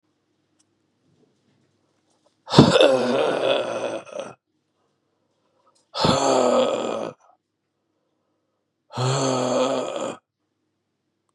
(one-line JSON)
{"exhalation_length": "11.3 s", "exhalation_amplitude": 32768, "exhalation_signal_mean_std_ratio": 0.43, "survey_phase": "beta (2021-08-13 to 2022-03-07)", "age": "45-64", "gender": "Male", "wearing_mask": "No", "symptom_new_continuous_cough": true, "symptom_runny_or_blocked_nose": true, "symptom_sore_throat": true, "symptom_abdominal_pain": true, "symptom_diarrhoea": true, "symptom_fatigue": true, "symptom_fever_high_temperature": true, "symptom_headache": true, "symptom_change_to_sense_of_smell_or_taste": true, "symptom_other": true, "symptom_onset": "2 days", "smoker_status": "Never smoked", "respiratory_condition_asthma": false, "respiratory_condition_other": false, "recruitment_source": "Test and Trace", "submission_delay": "2 days", "covid_test_result": "Positive", "covid_test_method": "RT-qPCR", "covid_ct_value": 22.9, "covid_ct_gene": "ORF1ab gene"}